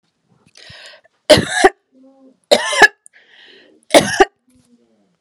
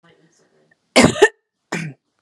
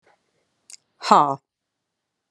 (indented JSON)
{
  "three_cough_length": "5.2 s",
  "three_cough_amplitude": 32768,
  "three_cough_signal_mean_std_ratio": 0.3,
  "cough_length": "2.2 s",
  "cough_amplitude": 32768,
  "cough_signal_mean_std_ratio": 0.29,
  "exhalation_length": "2.3 s",
  "exhalation_amplitude": 31401,
  "exhalation_signal_mean_std_ratio": 0.22,
  "survey_phase": "beta (2021-08-13 to 2022-03-07)",
  "age": "45-64",
  "gender": "Female",
  "wearing_mask": "No",
  "symptom_runny_or_blocked_nose": true,
  "symptom_sore_throat": true,
  "symptom_abdominal_pain": true,
  "symptom_fatigue": true,
  "smoker_status": "Never smoked",
  "respiratory_condition_asthma": false,
  "respiratory_condition_other": false,
  "recruitment_source": "Test and Trace",
  "submission_delay": "2 days",
  "covid_test_result": "Positive",
  "covid_test_method": "LFT"
}